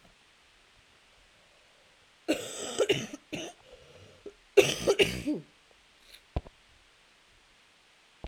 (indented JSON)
{
  "cough_length": "8.3 s",
  "cough_amplitude": 15465,
  "cough_signal_mean_std_ratio": 0.3,
  "survey_phase": "alpha (2021-03-01 to 2021-08-12)",
  "age": "18-44",
  "gender": "Female",
  "wearing_mask": "No",
  "symptom_cough_any": true,
  "symptom_onset": "3 days",
  "smoker_status": "Ex-smoker",
  "respiratory_condition_asthma": false,
  "respiratory_condition_other": false,
  "recruitment_source": "Test and Trace",
  "submission_delay": "2 days",
  "covid_test_result": "Positive",
  "covid_test_method": "RT-qPCR",
  "covid_ct_value": 22.6,
  "covid_ct_gene": "ORF1ab gene",
  "covid_ct_mean": 22.9,
  "covid_viral_load": "31000 copies/ml",
  "covid_viral_load_category": "Low viral load (10K-1M copies/ml)"
}